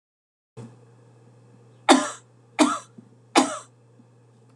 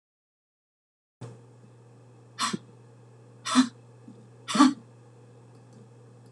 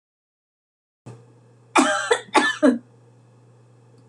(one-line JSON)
{"three_cough_length": "4.6 s", "three_cough_amplitude": 26018, "three_cough_signal_mean_std_ratio": 0.28, "exhalation_length": "6.3 s", "exhalation_amplitude": 16779, "exhalation_signal_mean_std_ratio": 0.27, "cough_length": "4.1 s", "cough_amplitude": 25328, "cough_signal_mean_std_ratio": 0.35, "survey_phase": "alpha (2021-03-01 to 2021-08-12)", "age": "45-64", "gender": "Female", "wearing_mask": "No", "symptom_none": true, "smoker_status": "Never smoked", "respiratory_condition_asthma": false, "respiratory_condition_other": false, "recruitment_source": "REACT", "submission_delay": "1 day", "covid_test_result": "Negative", "covid_test_method": "RT-qPCR"}